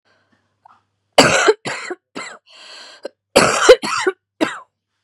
{"cough_length": "5.0 s", "cough_amplitude": 32768, "cough_signal_mean_std_ratio": 0.37, "survey_phase": "beta (2021-08-13 to 2022-03-07)", "age": "45-64", "wearing_mask": "No", "symptom_cough_any": true, "symptom_shortness_of_breath": true, "symptom_sore_throat": true, "symptom_fatigue": true, "symptom_headache": true, "symptom_onset": "8 days", "smoker_status": "Never smoked", "respiratory_condition_asthma": true, "respiratory_condition_other": false, "recruitment_source": "Test and Trace", "submission_delay": "2 days", "covid_test_result": "Negative", "covid_test_method": "RT-qPCR"}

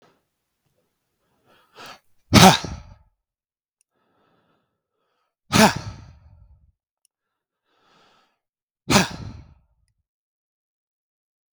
{"exhalation_length": "11.5 s", "exhalation_amplitude": 32768, "exhalation_signal_mean_std_ratio": 0.19, "survey_phase": "beta (2021-08-13 to 2022-03-07)", "age": "45-64", "gender": "Male", "wearing_mask": "No", "symptom_none": true, "smoker_status": "Never smoked", "respiratory_condition_asthma": true, "respiratory_condition_other": false, "recruitment_source": "REACT", "submission_delay": "7 days", "covid_test_result": "Negative", "covid_test_method": "RT-qPCR", "influenza_a_test_result": "Negative", "influenza_b_test_result": "Negative"}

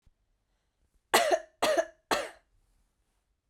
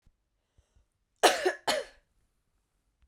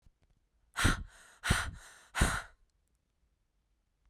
{"three_cough_length": "3.5 s", "three_cough_amplitude": 12493, "three_cough_signal_mean_std_ratio": 0.33, "cough_length": "3.1 s", "cough_amplitude": 15180, "cough_signal_mean_std_ratio": 0.26, "exhalation_length": "4.1 s", "exhalation_amplitude": 7480, "exhalation_signal_mean_std_ratio": 0.33, "survey_phase": "beta (2021-08-13 to 2022-03-07)", "age": "18-44", "gender": "Female", "wearing_mask": "No", "symptom_runny_or_blocked_nose": true, "symptom_shortness_of_breath": true, "symptom_diarrhoea": true, "symptom_fatigue": true, "symptom_fever_high_temperature": true, "symptom_headache": true, "smoker_status": "Never smoked", "respiratory_condition_asthma": false, "respiratory_condition_other": false, "recruitment_source": "Test and Trace", "submission_delay": "2 days", "covid_test_result": "Positive", "covid_test_method": "RT-qPCR", "covid_ct_value": 27.0, "covid_ct_gene": "ORF1ab gene"}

